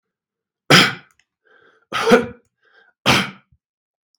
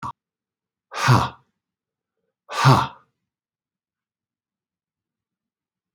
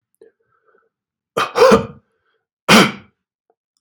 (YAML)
three_cough_length: 4.2 s
three_cough_amplitude: 32767
three_cough_signal_mean_std_ratio: 0.32
exhalation_length: 5.9 s
exhalation_amplitude: 32688
exhalation_signal_mean_std_ratio: 0.25
cough_length: 3.8 s
cough_amplitude: 32768
cough_signal_mean_std_ratio: 0.31
survey_phase: beta (2021-08-13 to 2022-03-07)
age: 65+
gender: Male
wearing_mask: 'No'
symptom_none: true
smoker_status: Never smoked
respiratory_condition_asthma: false
respiratory_condition_other: false
recruitment_source: REACT
submission_delay: 4 days
covid_test_result: Negative
covid_test_method: RT-qPCR
influenza_a_test_result: Negative
influenza_b_test_result: Negative